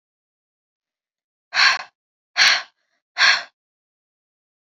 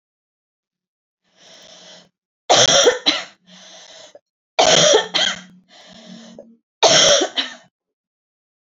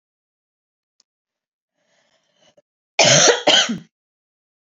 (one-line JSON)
{"exhalation_length": "4.6 s", "exhalation_amplitude": 27480, "exhalation_signal_mean_std_ratio": 0.3, "three_cough_length": "8.8 s", "three_cough_amplitude": 32381, "three_cough_signal_mean_std_ratio": 0.38, "cough_length": "4.6 s", "cough_amplitude": 32768, "cough_signal_mean_std_ratio": 0.3, "survey_phase": "beta (2021-08-13 to 2022-03-07)", "age": "18-44", "gender": "Female", "wearing_mask": "No", "symptom_none": true, "smoker_status": "Never smoked", "respiratory_condition_asthma": false, "respiratory_condition_other": false, "recruitment_source": "REACT", "submission_delay": "1 day", "covid_test_result": "Negative", "covid_test_method": "RT-qPCR"}